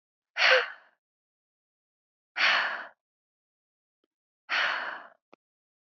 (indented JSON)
{
  "exhalation_length": "5.9 s",
  "exhalation_amplitude": 14620,
  "exhalation_signal_mean_std_ratio": 0.33,
  "survey_phase": "beta (2021-08-13 to 2022-03-07)",
  "age": "18-44",
  "gender": "Female",
  "wearing_mask": "No",
  "symptom_none": true,
  "symptom_onset": "11 days",
  "smoker_status": "Ex-smoker",
  "respiratory_condition_asthma": true,
  "respiratory_condition_other": false,
  "recruitment_source": "REACT",
  "submission_delay": "8 days",
  "covid_test_result": "Negative",
  "covid_test_method": "RT-qPCR",
  "influenza_a_test_result": "Negative",
  "influenza_b_test_result": "Negative"
}